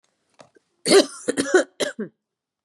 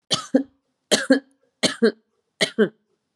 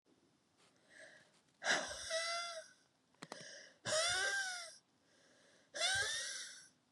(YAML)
cough_length: 2.6 s
cough_amplitude: 23433
cough_signal_mean_std_ratio: 0.35
three_cough_length: 3.2 s
three_cough_amplitude: 29025
three_cough_signal_mean_std_ratio: 0.36
exhalation_length: 6.9 s
exhalation_amplitude: 2650
exhalation_signal_mean_std_ratio: 0.54
survey_phase: beta (2021-08-13 to 2022-03-07)
age: 18-44
gender: Female
wearing_mask: 'No'
symptom_cough_any: true
symptom_new_continuous_cough: true
symptom_runny_or_blocked_nose: true
symptom_sore_throat: true
symptom_fatigue: true
symptom_fever_high_temperature: true
symptom_headache: true
symptom_onset: 3 days
smoker_status: Current smoker (e-cigarettes or vapes only)
respiratory_condition_asthma: false
respiratory_condition_other: false
recruitment_source: Test and Trace
submission_delay: 1 day
covid_test_result: Positive
covid_test_method: RT-qPCR
covid_ct_value: 17.3
covid_ct_gene: ORF1ab gene